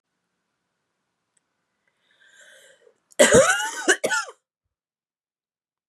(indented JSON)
{
  "cough_length": "5.9 s",
  "cough_amplitude": 30582,
  "cough_signal_mean_std_ratio": 0.27,
  "survey_phase": "beta (2021-08-13 to 2022-03-07)",
  "age": "45-64",
  "gender": "Female",
  "wearing_mask": "No",
  "symptom_cough_any": true,
  "symptom_runny_or_blocked_nose": true,
  "symptom_shortness_of_breath": true,
  "symptom_fatigue": true,
  "symptom_fever_high_temperature": true,
  "symptom_headache": true,
  "symptom_change_to_sense_of_smell_or_taste": true,
  "symptom_loss_of_taste": true,
  "symptom_onset": "5 days",
  "smoker_status": "Never smoked",
  "respiratory_condition_asthma": false,
  "respiratory_condition_other": false,
  "recruitment_source": "Test and Trace",
  "submission_delay": "1 day",
  "covid_test_result": "Positive",
  "covid_test_method": "ePCR"
}